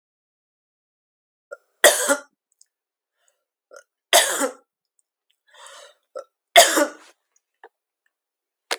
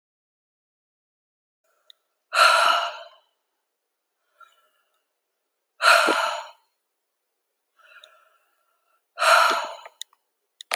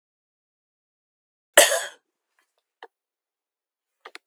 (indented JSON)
{
  "three_cough_length": "8.8 s",
  "three_cough_amplitude": 32768,
  "three_cough_signal_mean_std_ratio": 0.24,
  "exhalation_length": "10.8 s",
  "exhalation_amplitude": 27418,
  "exhalation_signal_mean_std_ratio": 0.31,
  "cough_length": "4.3 s",
  "cough_amplitude": 32767,
  "cough_signal_mean_std_ratio": 0.16,
  "survey_phase": "beta (2021-08-13 to 2022-03-07)",
  "age": "65+",
  "gender": "Female",
  "wearing_mask": "No",
  "symptom_none": true,
  "smoker_status": "Ex-smoker",
  "respiratory_condition_asthma": false,
  "respiratory_condition_other": false,
  "recruitment_source": "REACT",
  "submission_delay": "1 day",
  "covid_test_result": "Negative",
  "covid_test_method": "RT-qPCR",
  "influenza_a_test_result": "Negative",
  "influenza_b_test_result": "Negative"
}